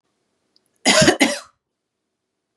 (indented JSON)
{
  "cough_length": "2.6 s",
  "cough_amplitude": 31520,
  "cough_signal_mean_std_ratio": 0.33,
  "survey_phase": "beta (2021-08-13 to 2022-03-07)",
  "age": "18-44",
  "gender": "Female",
  "wearing_mask": "No",
  "symptom_none": true,
  "smoker_status": "Never smoked",
  "respiratory_condition_asthma": false,
  "respiratory_condition_other": false,
  "recruitment_source": "REACT",
  "submission_delay": "0 days",
  "covid_test_result": "Negative",
  "covid_test_method": "RT-qPCR",
  "influenza_a_test_result": "Negative",
  "influenza_b_test_result": "Negative"
}